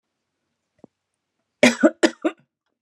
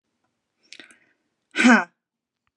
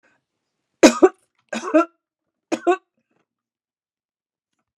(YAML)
cough_length: 2.8 s
cough_amplitude: 30215
cough_signal_mean_std_ratio: 0.24
exhalation_length: 2.6 s
exhalation_amplitude: 29072
exhalation_signal_mean_std_ratio: 0.25
three_cough_length: 4.8 s
three_cough_amplitude: 32768
three_cough_signal_mean_std_ratio: 0.23
survey_phase: beta (2021-08-13 to 2022-03-07)
age: 45-64
gender: Female
wearing_mask: 'No'
symptom_none: true
smoker_status: Ex-smoker
respiratory_condition_asthma: false
respiratory_condition_other: false
recruitment_source: REACT
submission_delay: 3 days
covid_test_result: Negative
covid_test_method: RT-qPCR